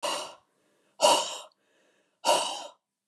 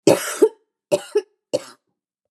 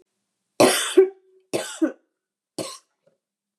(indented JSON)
{
  "exhalation_length": "3.1 s",
  "exhalation_amplitude": 13361,
  "exhalation_signal_mean_std_ratio": 0.4,
  "cough_length": "2.3 s",
  "cough_amplitude": 32193,
  "cough_signal_mean_std_ratio": 0.34,
  "three_cough_length": "3.6 s",
  "three_cough_amplitude": 23648,
  "three_cough_signal_mean_std_ratio": 0.32,
  "survey_phase": "beta (2021-08-13 to 2022-03-07)",
  "age": "45-64",
  "gender": "Female",
  "wearing_mask": "No",
  "symptom_none": true,
  "smoker_status": "Ex-smoker",
  "respiratory_condition_asthma": false,
  "respiratory_condition_other": false,
  "recruitment_source": "REACT",
  "submission_delay": "0 days",
  "covid_test_result": "Negative",
  "covid_test_method": "RT-qPCR",
  "influenza_a_test_result": "Negative",
  "influenza_b_test_result": "Negative"
}